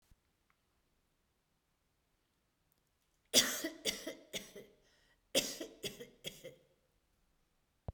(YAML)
cough_length: 7.9 s
cough_amplitude: 7307
cough_signal_mean_std_ratio: 0.26
survey_phase: beta (2021-08-13 to 2022-03-07)
age: 65+
gender: Female
wearing_mask: 'No'
symptom_none: true
symptom_onset: 12 days
smoker_status: Ex-smoker
respiratory_condition_asthma: false
respiratory_condition_other: false
recruitment_source: REACT
submission_delay: 1 day
covid_test_result: Negative
covid_test_method: RT-qPCR